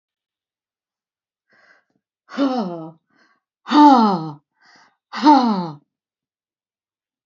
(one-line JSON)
{"exhalation_length": "7.3 s", "exhalation_amplitude": 27853, "exhalation_signal_mean_std_ratio": 0.33, "survey_phase": "alpha (2021-03-01 to 2021-08-12)", "age": "65+", "gender": "Female", "wearing_mask": "No", "symptom_none": true, "smoker_status": "Never smoked", "respiratory_condition_asthma": false, "respiratory_condition_other": false, "recruitment_source": "REACT", "submission_delay": "1 day", "covid_test_result": "Negative", "covid_test_method": "RT-qPCR"}